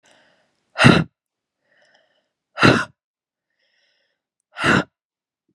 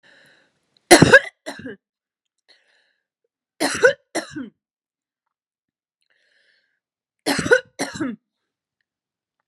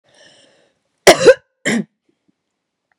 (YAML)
exhalation_length: 5.5 s
exhalation_amplitude: 32768
exhalation_signal_mean_std_ratio: 0.27
three_cough_length: 9.5 s
three_cough_amplitude: 32768
three_cough_signal_mean_std_ratio: 0.23
cough_length: 3.0 s
cough_amplitude: 32768
cough_signal_mean_std_ratio: 0.26
survey_phase: beta (2021-08-13 to 2022-03-07)
age: 45-64
gender: Female
wearing_mask: 'No'
symptom_cough_any: true
symptom_runny_or_blocked_nose: true
symptom_sore_throat: true
symptom_headache: true
symptom_change_to_sense_of_smell_or_taste: true
symptom_onset: 4 days
smoker_status: Never smoked
respiratory_condition_asthma: false
respiratory_condition_other: false
recruitment_source: Test and Trace
submission_delay: 2 days
covid_test_result: Positive
covid_test_method: RT-qPCR
covid_ct_value: 17.3
covid_ct_gene: ORF1ab gene
covid_ct_mean: 17.7
covid_viral_load: 1500000 copies/ml
covid_viral_load_category: High viral load (>1M copies/ml)